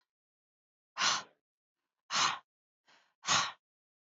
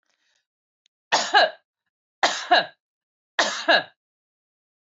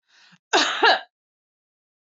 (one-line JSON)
{"exhalation_length": "4.0 s", "exhalation_amplitude": 5092, "exhalation_signal_mean_std_ratio": 0.34, "three_cough_length": "4.9 s", "three_cough_amplitude": 19219, "three_cough_signal_mean_std_ratio": 0.33, "cough_length": "2.0 s", "cough_amplitude": 19818, "cough_signal_mean_std_ratio": 0.35, "survey_phase": "beta (2021-08-13 to 2022-03-07)", "age": "45-64", "gender": "Female", "wearing_mask": "No", "symptom_none": true, "symptom_onset": "7 days", "smoker_status": "Ex-smoker", "respiratory_condition_asthma": false, "respiratory_condition_other": false, "recruitment_source": "REACT", "submission_delay": "5 days", "covid_test_result": "Negative", "covid_test_method": "RT-qPCR", "influenza_a_test_result": "Unknown/Void", "influenza_b_test_result": "Unknown/Void"}